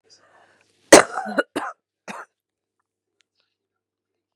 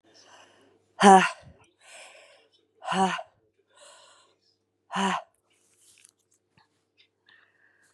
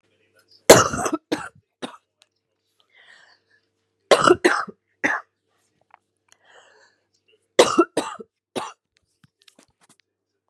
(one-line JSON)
{"cough_length": "4.4 s", "cough_amplitude": 32768, "cough_signal_mean_std_ratio": 0.18, "exhalation_length": "7.9 s", "exhalation_amplitude": 26479, "exhalation_signal_mean_std_ratio": 0.22, "three_cough_length": "10.5 s", "three_cough_amplitude": 32768, "three_cough_signal_mean_std_ratio": 0.24, "survey_phase": "beta (2021-08-13 to 2022-03-07)", "age": "45-64", "gender": "Female", "wearing_mask": "Yes", "symptom_cough_any": true, "symptom_new_continuous_cough": true, "symptom_runny_or_blocked_nose": true, "symptom_shortness_of_breath": true, "symptom_sore_throat": true, "symptom_diarrhoea": true, "symptom_fatigue": true, "symptom_headache": true, "symptom_onset": "12 days", "smoker_status": "Current smoker (e-cigarettes or vapes only)", "respiratory_condition_asthma": false, "respiratory_condition_other": false, "recruitment_source": "Test and Trace", "submission_delay": "5 days", "covid_test_result": "Negative", "covid_test_method": "RT-qPCR"}